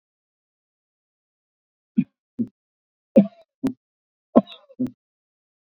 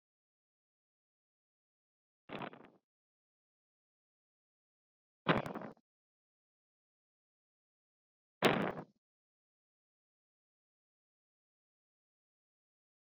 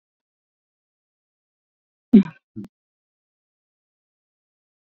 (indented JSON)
{
  "three_cough_length": "5.7 s",
  "three_cough_amplitude": 32768,
  "three_cough_signal_mean_std_ratio": 0.19,
  "exhalation_length": "13.1 s",
  "exhalation_amplitude": 8482,
  "exhalation_signal_mean_std_ratio": 0.16,
  "cough_length": "4.9 s",
  "cough_amplitude": 26930,
  "cough_signal_mean_std_ratio": 0.12,
  "survey_phase": "beta (2021-08-13 to 2022-03-07)",
  "age": "45-64",
  "gender": "Female",
  "wearing_mask": "No",
  "symptom_none": true,
  "smoker_status": "Never smoked",
  "respiratory_condition_asthma": false,
  "respiratory_condition_other": false,
  "recruitment_source": "Test and Trace",
  "submission_delay": "5 days",
  "covid_test_result": "Negative",
  "covid_test_method": "RT-qPCR"
}